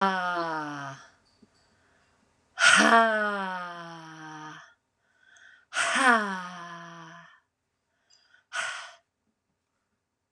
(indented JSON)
{
  "exhalation_length": "10.3 s",
  "exhalation_amplitude": 18136,
  "exhalation_signal_mean_std_ratio": 0.4,
  "survey_phase": "beta (2021-08-13 to 2022-03-07)",
  "age": "45-64",
  "gender": "Female",
  "wearing_mask": "No",
  "symptom_cough_any": true,
  "symptom_new_continuous_cough": true,
  "symptom_sore_throat": true,
  "symptom_abdominal_pain": true,
  "symptom_diarrhoea": true,
  "symptom_fatigue": true,
  "symptom_fever_high_temperature": true,
  "symptom_headache": true,
  "symptom_onset": "3 days",
  "smoker_status": "Never smoked",
  "respiratory_condition_asthma": true,
  "respiratory_condition_other": false,
  "recruitment_source": "Test and Trace",
  "submission_delay": "1 day",
  "covid_test_result": "Negative",
  "covid_test_method": "RT-qPCR"
}